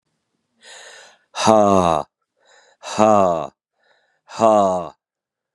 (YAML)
exhalation_length: 5.5 s
exhalation_amplitude: 32767
exhalation_signal_mean_std_ratio: 0.4
survey_phase: beta (2021-08-13 to 2022-03-07)
age: 45-64
gender: Male
wearing_mask: 'No'
symptom_cough_any: true
symptom_new_continuous_cough: true
symptom_runny_or_blocked_nose: true
symptom_fatigue: true
symptom_fever_high_temperature: true
symptom_headache: true
symptom_other: true
smoker_status: Never smoked
respiratory_condition_asthma: false
respiratory_condition_other: false
recruitment_source: Test and Trace
submission_delay: 2 days
covid_test_result: Positive
covid_test_method: LFT